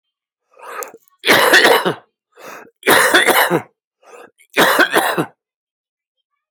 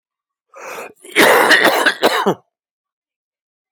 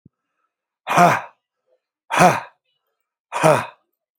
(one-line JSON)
{"three_cough_length": "6.5 s", "three_cough_amplitude": 32448, "three_cough_signal_mean_std_ratio": 0.47, "cough_length": "3.7 s", "cough_amplitude": 32768, "cough_signal_mean_std_ratio": 0.46, "exhalation_length": "4.2 s", "exhalation_amplitude": 32768, "exhalation_signal_mean_std_ratio": 0.35, "survey_phase": "alpha (2021-03-01 to 2021-08-12)", "age": "45-64", "gender": "Male", "wearing_mask": "No", "symptom_none": true, "smoker_status": "Current smoker (1 to 10 cigarettes per day)", "respiratory_condition_asthma": false, "respiratory_condition_other": false, "recruitment_source": "REACT", "submission_delay": "2 days", "covid_test_result": "Negative", "covid_test_method": "RT-qPCR"}